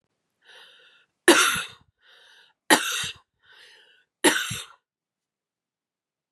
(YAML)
three_cough_length: 6.3 s
three_cough_amplitude: 31038
three_cough_signal_mean_std_ratio: 0.28
survey_phase: beta (2021-08-13 to 2022-03-07)
age: 18-44
gender: Female
wearing_mask: 'No'
symptom_cough_any: true
symptom_runny_or_blocked_nose: true
symptom_abdominal_pain: true
symptom_fever_high_temperature: true
symptom_headache: true
smoker_status: Ex-smoker
respiratory_condition_asthma: false
respiratory_condition_other: false
recruitment_source: Test and Trace
submission_delay: 2 days
covid_test_result: Positive
covid_test_method: RT-qPCR
covid_ct_value: 15.8
covid_ct_gene: ORF1ab gene
covid_ct_mean: 18.1
covid_viral_load: 1200000 copies/ml
covid_viral_load_category: High viral load (>1M copies/ml)